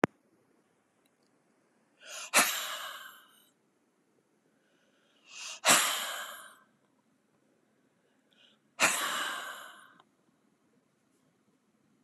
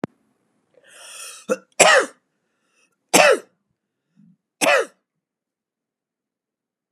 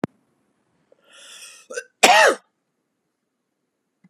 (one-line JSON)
{"exhalation_length": "12.0 s", "exhalation_amplitude": 17804, "exhalation_signal_mean_std_ratio": 0.29, "three_cough_length": "6.9 s", "three_cough_amplitude": 32768, "three_cough_signal_mean_std_ratio": 0.27, "cough_length": "4.1 s", "cough_amplitude": 32768, "cough_signal_mean_std_ratio": 0.25, "survey_phase": "beta (2021-08-13 to 2022-03-07)", "age": "65+", "gender": "Female", "wearing_mask": "No", "symptom_none": true, "smoker_status": "Ex-smoker", "respiratory_condition_asthma": true, "respiratory_condition_other": false, "recruitment_source": "REACT", "submission_delay": "2 days", "covid_test_result": "Negative", "covid_test_method": "RT-qPCR"}